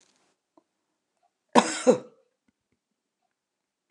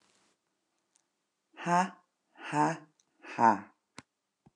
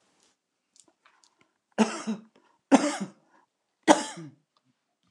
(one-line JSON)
{"cough_length": "3.9 s", "cough_amplitude": 29069, "cough_signal_mean_std_ratio": 0.19, "exhalation_length": "4.6 s", "exhalation_amplitude": 10878, "exhalation_signal_mean_std_ratio": 0.3, "three_cough_length": "5.1 s", "three_cough_amplitude": 25845, "three_cough_signal_mean_std_ratio": 0.25, "survey_phase": "beta (2021-08-13 to 2022-03-07)", "age": "45-64", "gender": "Female", "wearing_mask": "No", "symptom_fatigue": true, "smoker_status": "Current smoker (1 to 10 cigarettes per day)", "respiratory_condition_asthma": false, "respiratory_condition_other": false, "recruitment_source": "REACT", "submission_delay": "4 days", "covid_test_result": "Negative", "covid_test_method": "RT-qPCR"}